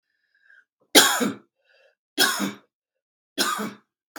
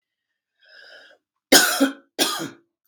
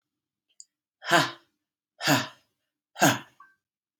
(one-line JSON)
{"three_cough_length": "4.2 s", "three_cough_amplitude": 32768, "three_cough_signal_mean_std_ratio": 0.34, "cough_length": "2.9 s", "cough_amplitude": 32768, "cough_signal_mean_std_ratio": 0.34, "exhalation_length": "4.0 s", "exhalation_amplitude": 17398, "exhalation_signal_mean_std_ratio": 0.29, "survey_phase": "beta (2021-08-13 to 2022-03-07)", "age": "45-64", "gender": "Female", "wearing_mask": "No", "symptom_none": true, "smoker_status": "Ex-smoker", "respiratory_condition_asthma": false, "respiratory_condition_other": false, "recruitment_source": "REACT", "submission_delay": "2 days", "covid_test_result": "Negative", "covid_test_method": "RT-qPCR", "influenza_a_test_result": "Negative", "influenza_b_test_result": "Negative"}